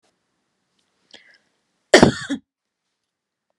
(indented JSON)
{
  "cough_length": "3.6 s",
  "cough_amplitude": 32768,
  "cough_signal_mean_std_ratio": 0.19,
  "survey_phase": "beta (2021-08-13 to 2022-03-07)",
  "age": "18-44",
  "gender": "Female",
  "wearing_mask": "No",
  "symptom_change_to_sense_of_smell_or_taste": true,
  "smoker_status": "Never smoked",
  "respiratory_condition_asthma": false,
  "respiratory_condition_other": false,
  "recruitment_source": "REACT",
  "submission_delay": "1 day",
  "covid_test_result": "Negative",
  "covid_test_method": "RT-qPCR",
  "influenza_a_test_result": "Negative",
  "influenza_b_test_result": "Negative"
}